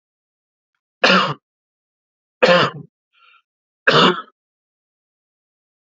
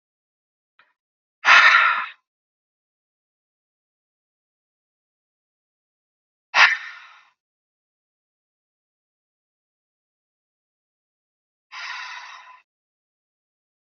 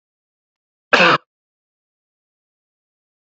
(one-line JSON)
{"three_cough_length": "5.9 s", "three_cough_amplitude": 32135, "three_cough_signal_mean_std_ratio": 0.3, "exhalation_length": "14.0 s", "exhalation_amplitude": 29294, "exhalation_signal_mean_std_ratio": 0.2, "cough_length": "3.3 s", "cough_amplitude": 28569, "cough_signal_mean_std_ratio": 0.21, "survey_phase": "beta (2021-08-13 to 2022-03-07)", "age": "18-44", "gender": "Male", "wearing_mask": "No", "symptom_cough_any": true, "symptom_sore_throat": true, "symptom_fatigue": true, "symptom_headache": true, "symptom_onset": "7 days", "smoker_status": "Never smoked", "respiratory_condition_asthma": false, "respiratory_condition_other": false, "recruitment_source": "REACT", "submission_delay": "1 day", "covid_test_result": "Negative", "covid_test_method": "RT-qPCR"}